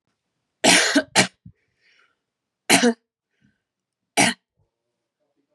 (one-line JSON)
{"three_cough_length": "5.5 s", "three_cough_amplitude": 30817, "three_cough_signal_mean_std_ratio": 0.31, "survey_phase": "beta (2021-08-13 to 2022-03-07)", "age": "18-44", "gender": "Female", "wearing_mask": "No", "symptom_runny_or_blocked_nose": true, "symptom_headache": true, "symptom_onset": "3 days", "smoker_status": "Never smoked", "respiratory_condition_asthma": false, "respiratory_condition_other": false, "recruitment_source": "Test and Trace", "submission_delay": "1 day", "covid_test_result": "Positive", "covid_test_method": "RT-qPCR", "covid_ct_value": 29.2, "covid_ct_gene": "N gene"}